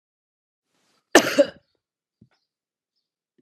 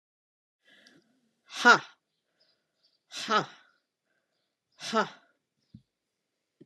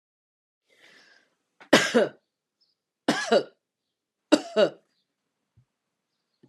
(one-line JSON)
{"cough_length": "3.4 s", "cough_amplitude": 32767, "cough_signal_mean_std_ratio": 0.18, "exhalation_length": "6.7 s", "exhalation_amplitude": 18907, "exhalation_signal_mean_std_ratio": 0.21, "three_cough_length": "6.5 s", "three_cough_amplitude": 27526, "three_cough_signal_mean_std_ratio": 0.26, "survey_phase": "alpha (2021-03-01 to 2021-08-12)", "age": "45-64", "gender": "Female", "wearing_mask": "No", "symptom_none": true, "smoker_status": "Ex-smoker", "respiratory_condition_asthma": false, "respiratory_condition_other": false, "recruitment_source": "REACT", "submission_delay": "1 day", "covid_test_result": "Negative", "covid_test_method": "RT-qPCR"}